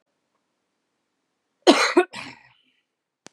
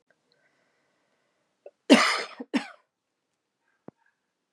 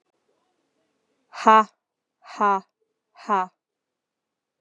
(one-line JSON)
{"cough_length": "3.3 s", "cough_amplitude": 32444, "cough_signal_mean_std_ratio": 0.24, "three_cough_length": "4.5 s", "three_cough_amplitude": 26787, "three_cough_signal_mean_std_ratio": 0.21, "exhalation_length": "4.6 s", "exhalation_amplitude": 27122, "exhalation_signal_mean_std_ratio": 0.25, "survey_phase": "beta (2021-08-13 to 2022-03-07)", "age": "18-44", "gender": "Female", "wearing_mask": "No", "symptom_new_continuous_cough": true, "symptom_runny_or_blocked_nose": true, "symptom_shortness_of_breath": true, "symptom_sore_throat": true, "symptom_fatigue": true, "symptom_fever_high_temperature": true, "symptom_headache": true, "symptom_onset": "3 days", "smoker_status": "Never smoked", "respiratory_condition_asthma": false, "respiratory_condition_other": false, "recruitment_source": "Test and Trace", "submission_delay": "2 days", "covid_test_result": "Positive", "covid_test_method": "ePCR"}